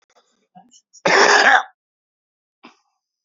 {
  "cough_length": "3.2 s",
  "cough_amplitude": 29999,
  "cough_signal_mean_std_ratio": 0.34,
  "survey_phase": "beta (2021-08-13 to 2022-03-07)",
  "age": "45-64",
  "gender": "Male",
  "wearing_mask": "No",
  "symptom_shortness_of_breath": true,
  "symptom_headache": true,
  "smoker_status": "Current smoker (11 or more cigarettes per day)",
  "respiratory_condition_asthma": false,
  "respiratory_condition_other": true,
  "recruitment_source": "REACT",
  "submission_delay": "2 days",
  "covid_test_result": "Negative",
  "covid_test_method": "RT-qPCR",
  "influenza_a_test_result": "Negative",
  "influenza_b_test_result": "Negative"
}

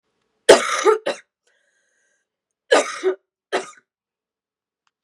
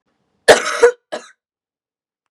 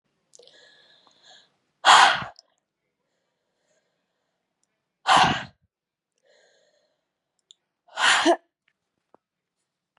{
  "three_cough_length": "5.0 s",
  "three_cough_amplitude": 32768,
  "three_cough_signal_mean_std_ratio": 0.29,
  "cough_length": "2.3 s",
  "cough_amplitude": 32768,
  "cough_signal_mean_std_ratio": 0.29,
  "exhalation_length": "10.0 s",
  "exhalation_amplitude": 25165,
  "exhalation_signal_mean_std_ratio": 0.25,
  "survey_phase": "beta (2021-08-13 to 2022-03-07)",
  "age": "18-44",
  "gender": "Female",
  "wearing_mask": "No",
  "symptom_cough_any": true,
  "symptom_runny_or_blocked_nose": true,
  "symptom_shortness_of_breath": true,
  "symptom_fatigue": true,
  "symptom_headache": true,
  "smoker_status": "Current smoker (e-cigarettes or vapes only)",
  "respiratory_condition_asthma": false,
  "respiratory_condition_other": false,
  "recruitment_source": "Test and Trace",
  "submission_delay": "2 days",
  "covid_test_result": "Positive",
  "covid_test_method": "RT-qPCR"
}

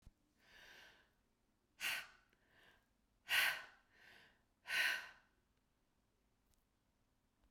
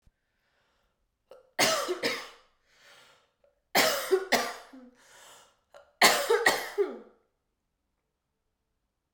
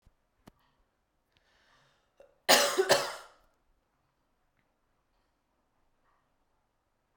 {
  "exhalation_length": "7.5 s",
  "exhalation_amplitude": 2136,
  "exhalation_signal_mean_std_ratio": 0.3,
  "three_cough_length": "9.1 s",
  "three_cough_amplitude": 18318,
  "three_cough_signal_mean_std_ratio": 0.36,
  "cough_length": "7.2 s",
  "cough_amplitude": 16099,
  "cough_signal_mean_std_ratio": 0.21,
  "survey_phase": "beta (2021-08-13 to 2022-03-07)",
  "age": "18-44",
  "gender": "Female",
  "wearing_mask": "No",
  "symptom_cough_any": true,
  "symptom_runny_or_blocked_nose": true,
  "symptom_shortness_of_breath": true,
  "symptom_abdominal_pain": true,
  "symptom_fatigue": true,
  "symptom_change_to_sense_of_smell_or_taste": true,
  "symptom_loss_of_taste": true,
  "symptom_onset": "3 days",
  "smoker_status": "Never smoked",
  "respiratory_condition_asthma": false,
  "respiratory_condition_other": false,
  "recruitment_source": "Test and Trace",
  "submission_delay": "2 days",
  "covid_test_result": "Positive",
  "covid_test_method": "RT-qPCR",
  "covid_ct_value": 16.2,
  "covid_ct_gene": "ORF1ab gene",
  "covid_ct_mean": 16.7,
  "covid_viral_load": "3300000 copies/ml",
  "covid_viral_load_category": "High viral load (>1M copies/ml)"
}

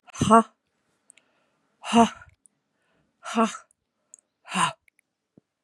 {
  "exhalation_length": "5.6 s",
  "exhalation_amplitude": 27620,
  "exhalation_signal_mean_std_ratio": 0.27,
  "survey_phase": "beta (2021-08-13 to 2022-03-07)",
  "age": "45-64",
  "gender": "Female",
  "wearing_mask": "No",
  "symptom_cough_any": true,
  "symptom_sore_throat": true,
  "symptom_headache": true,
  "symptom_onset": "5 days",
  "smoker_status": "Ex-smoker",
  "respiratory_condition_asthma": false,
  "respiratory_condition_other": false,
  "recruitment_source": "Test and Trace",
  "submission_delay": "2 days",
  "covid_test_result": "Positive",
  "covid_test_method": "RT-qPCR",
  "covid_ct_value": 19.9,
  "covid_ct_gene": "N gene"
}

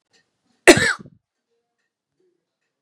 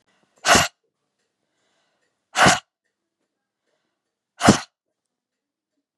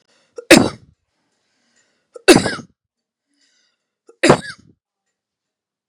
{
  "cough_length": "2.8 s",
  "cough_amplitude": 32768,
  "cough_signal_mean_std_ratio": 0.2,
  "exhalation_length": "6.0 s",
  "exhalation_amplitude": 32768,
  "exhalation_signal_mean_std_ratio": 0.24,
  "three_cough_length": "5.9 s",
  "three_cough_amplitude": 32768,
  "three_cough_signal_mean_std_ratio": 0.23,
  "survey_phase": "beta (2021-08-13 to 2022-03-07)",
  "age": "45-64",
  "gender": "Female",
  "wearing_mask": "No",
  "symptom_change_to_sense_of_smell_or_taste": true,
  "smoker_status": "Never smoked",
  "respiratory_condition_asthma": false,
  "respiratory_condition_other": false,
  "recruitment_source": "REACT",
  "submission_delay": "2 days",
  "covid_test_result": "Negative",
  "covid_test_method": "RT-qPCR",
  "influenza_a_test_result": "Negative",
  "influenza_b_test_result": "Negative"
}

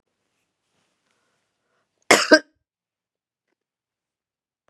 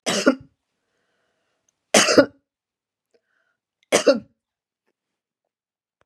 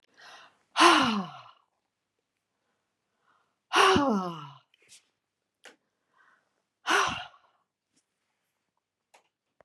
{
  "cough_length": "4.7 s",
  "cough_amplitude": 32767,
  "cough_signal_mean_std_ratio": 0.15,
  "three_cough_length": "6.1 s",
  "three_cough_amplitude": 32346,
  "three_cough_signal_mean_std_ratio": 0.26,
  "exhalation_length": "9.6 s",
  "exhalation_amplitude": 19837,
  "exhalation_signal_mean_std_ratio": 0.29,
  "survey_phase": "beta (2021-08-13 to 2022-03-07)",
  "age": "65+",
  "gender": "Female",
  "wearing_mask": "No",
  "symptom_none": true,
  "smoker_status": "Never smoked",
  "respiratory_condition_asthma": false,
  "respiratory_condition_other": false,
  "recruitment_source": "REACT",
  "submission_delay": "2 days",
  "covid_test_result": "Negative",
  "covid_test_method": "RT-qPCR",
  "influenza_a_test_result": "Negative",
  "influenza_b_test_result": "Negative"
}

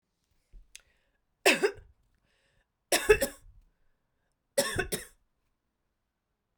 {
  "three_cough_length": "6.6 s",
  "three_cough_amplitude": 14362,
  "three_cough_signal_mean_std_ratio": 0.26,
  "survey_phase": "beta (2021-08-13 to 2022-03-07)",
  "age": "45-64",
  "gender": "Female",
  "wearing_mask": "No",
  "symptom_cough_any": true,
  "symptom_runny_or_blocked_nose": true,
  "symptom_fatigue": true,
  "symptom_fever_high_temperature": true,
  "symptom_change_to_sense_of_smell_or_taste": true,
  "symptom_loss_of_taste": true,
  "symptom_onset": "5 days",
  "smoker_status": "Never smoked",
  "respiratory_condition_asthma": false,
  "respiratory_condition_other": false,
  "recruitment_source": "Test and Trace",
  "submission_delay": "2 days",
  "covid_test_result": "Positive",
  "covid_test_method": "RT-qPCR",
  "covid_ct_value": 16.5,
  "covid_ct_gene": "ORF1ab gene",
  "covid_ct_mean": 17.3,
  "covid_viral_load": "2200000 copies/ml",
  "covid_viral_load_category": "High viral load (>1M copies/ml)"
}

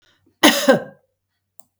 {
  "cough_length": "1.8 s",
  "cough_amplitude": 32768,
  "cough_signal_mean_std_ratio": 0.32,
  "survey_phase": "beta (2021-08-13 to 2022-03-07)",
  "age": "65+",
  "gender": "Female",
  "wearing_mask": "No",
  "symptom_new_continuous_cough": true,
  "symptom_sore_throat": true,
  "symptom_onset": "12 days",
  "smoker_status": "Ex-smoker",
  "respiratory_condition_asthma": false,
  "respiratory_condition_other": false,
  "recruitment_source": "REACT",
  "submission_delay": "3 days",
  "covid_test_result": "Negative",
  "covid_test_method": "RT-qPCR",
  "influenza_a_test_result": "Negative",
  "influenza_b_test_result": "Negative"
}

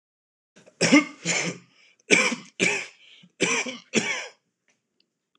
{
  "three_cough_length": "5.4 s",
  "three_cough_amplitude": 22818,
  "three_cough_signal_mean_std_ratio": 0.41,
  "survey_phase": "alpha (2021-03-01 to 2021-08-12)",
  "age": "18-44",
  "gender": "Male",
  "wearing_mask": "No",
  "symptom_none": true,
  "smoker_status": "Never smoked",
  "respiratory_condition_asthma": false,
  "respiratory_condition_other": false,
  "recruitment_source": "REACT",
  "submission_delay": "4 days",
  "covid_test_result": "Negative",
  "covid_test_method": "RT-qPCR"
}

